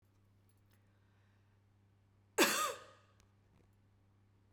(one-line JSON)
{"cough_length": "4.5 s", "cough_amplitude": 5267, "cough_signal_mean_std_ratio": 0.25, "survey_phase": "beta (2021-08-13 to 2022-03-07)", "age": "45-64", "gender": "Female", "wearing_mask": "No", "symptom_none": true, "smoker_status": "Never smoked", "respiratory_condition_asthma": false, "respiratory_condition_other": false, "recruitment_source": "REACT", "submission_delay": "1 day", "covid_test_result": "Negative", "covid_test_method": "RT-qPCR"}